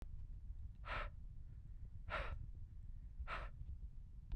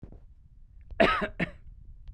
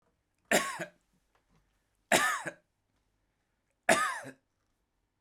exhalation_length: 4.4 s
exhalation_amplitude: 946
exhalation_signal_mean_std_ratio: 1.08
cough_length: 2.1 s
cough_amplitude: 13275
cough_signal_mean_std_ratio: 0.41
three_cough_length: 5.2 s
three_cough_amplitude: 10531
three_cough_signal_mean_std_ratio: 0.31
survey_phase: beta (2021-08-13 to 2022-03-07)
age: 45-64
gender: Male
wearing_mask: 'No'
symptom_none: true
smoker_status: Ex-smoker
respiratory_condition_asthma: false
respiratory_condition_other: false
recruitment_source: Test and Trace
submission_delay: 0 days
covid_test_result: Negative
covid_test_method: LFT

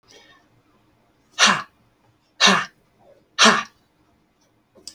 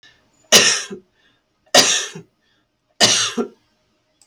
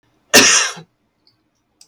exhalation_length: 4.9 s
exhalation_amplitude: 29975
exhalation_signal_mean_std_ratio: 0.29
three_cough_length: 4.3 s
three_cough_amplitude: 32767
three_cough_signal_mean_std_ratio: 0.37
cough_length: 1.9 s
cough_amplitude: 32768
cough_signal_mean_std_ratio: 0.36
survey_phase: alpha (2021-03-01 to 2021-08-12)
age: 45-64
gender: Female
wearing_mask: 'No'
symptom_none: true
smoker_status: Ex-smoker
recruitment_source: REACT
submission_delay: 2 days
covid_test_result: Negative
covid_test_method: RT-qPCR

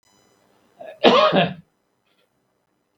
cough_length: 3.0 s
cough_amplitude: 32767
cough_signal_mean_std_ratio: 0.32
survey_phase: beta (2021-08-13 to 2022-03-07)
age: 65+
gender: Male
wearing_mask: 'No'
symptom_none: true
smoker_status: Ex-smoker
respiratory_condition_asthma: false
respiratory_condition_other: false
recruitment_source: REACT
submission_delay: 3 days
covid_test_result: Negative
covid_test_method: RT-qPCR
influenza_a_test_result: Negative
influenza_b_test_result: Negative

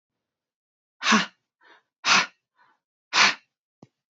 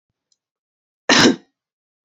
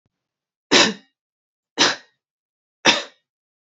exhalation_length: 4.1 s
exhalation_amplitude: 17549
exhalation_signal_mean_std_ratio: 0.3
cough_length: 2.0 s
cough_amplitude: 32192
cough_signal_mean_std_ratio: 0.28
three_cough_length: 3.8 s
three_cough_amplitude: 31892
three_cough_signal_mean_std_ratio: 0.28
survey_phase: beta (2021-08-13 to 2022-03-07)
age: 18-44
gender: Female
wearing_mask: 'No'
symptom_sore_throat: true
symptom_diarrhoea: true
symptom_fatigue: true
symptom_headache: true
symptom_other: true
smoker_status: Never smoked
respiratory_condition_asthma: true
respiratory_condition_other: false
recruitment_source: Test and Trace
submission_delay: 2 days
covid_test_result: Positive
covid_test_method: RT-qPCR
covid_ct_value: 31.2
covid_ct_gene: N gene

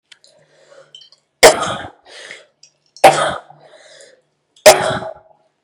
three_cough_length: 5.6 s
three_cough_amplitude: 32768
three_cough_signal_mean_std_ratio: 0.29
survey_phase: beta (2021-08-13 to 2022-03-07)
age: 18-44
gender: Female
wearing_mask: 'No'
symptom_cough_any: true
symptom_runny_or_blocked_nose: true
symptom_shortness_of_breath: true
symptom_sore_throat: true
symptom_diarrhoea: true
symptom_headache: true
symptom_onset: 4 days
smoker_status: Ex-smoker
respiratory_condition_asthma: false
respiratory_condition_other: false
recruitment_source: Test and Trace
submission_delay: 2 days
covid_test_method: ePCR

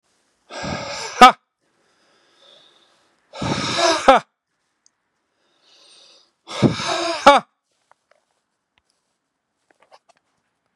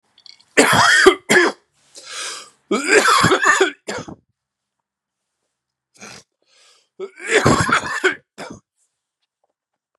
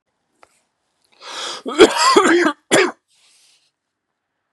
exhalation_length: 10.8 s
exhalation_amplitude: 32768
exhalation_signal_mean_std_ratio: 0.26
three_cough_length: 10.0 s
three_cough_amplitude: 32768
three_cough_signal_mean_std_ratio: 0.43
cough_length: 4.5 s
cough_amplitude: 32768
cough_signal_mean_std_ratio: 0.38
survey_phase: beta (2021-08-13 to 2022-03-07)
age: 45-64
gender: Male
wearing_mask: 'No'
symptom_cough_any: true
smoker_status: Ex-smoker
respiratory_condition_asthma: false
respiratory_condition_other: false
recruitment_source: REACT
submission_delay: 1 day
covid_test_result: Negative
covid_test_method: RT-qPCR
influenza_a_test_result: Negative
influenza_b_test_result: Negative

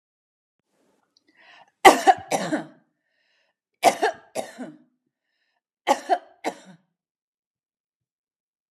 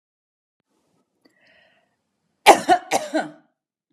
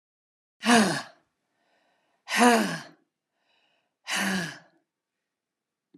three_cough_length: 8.7 s
three_cough_amplitude: 32768
three_cough_signal_mean_std_ratio: 0.23
cough_length: 3.9 s
cough_amplitude: 32768
cough_signal_mean_std_ratio: 0.23
exhalation_length: 6.0 s
exhalation_amplitude: 19013
exhalation_signal_mean_std_ratio: 0.33
survey_phase: beta (2021-08-13 to 2022-03-07)
age: 45-64
gender: Female
wearing_mask: 'No'
symptom_none: true
smoker_status: Never smoked
respiratory_condition_asthma: false
respiratory_condition_other: false
recruitment_source: REACT
submission_delay: 1 day
covid_test_result: Negative
covid_test_method: RT-qPCR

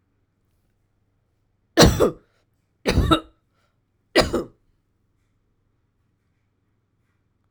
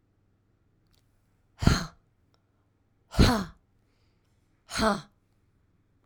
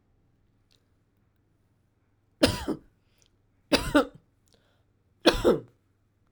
three_cough_length: 7.5 s
three_cough_amplitude: 32767
three_cough_signal_mean_std_ratio: 0.25
exhalation_length: 6.1 s
exhalation_amplitude: 23062
exhalation_signal_mean_std_ratio: 0.26
cough_length: 6.3 s
cough_amplitude: 20849
cough_signal_mean_std_ratio: 0.26
survey_phase: alpha (2021-03-01 to 2021-08-12)
age: 45-64
gender: Female
wearing_mask: 'No'
symptom_none: true
smoker_status: Never smoked
respiratory_condition_asthma: true
respiratory_condition_other: false
recruitment_source: REACT
submission_delay: 7 days
covid_test_result: Negative
covid_test_method: RT-qPCR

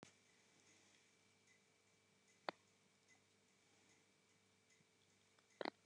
exhalation_length: 5.9 s
exhalation_amplitude: 1570
exhalation_signal_mean_std_ratio: 0.22
survey_phase: beta (2021-08-13 to 2022-03-07)
age: 65+
gender: Female
wearing_mask: 'No'
symptom_none: true
smoker_status: Never smoked
respiratory_condition_asthma: false
respiratory_condition_other: false
recruitment_source: REACT
submission_delay: 1 day
covid_test_result: Negative
covid_test_method: RT-qPCR
influenza_a_test_result: Negative
influenza_b_test_result: Negative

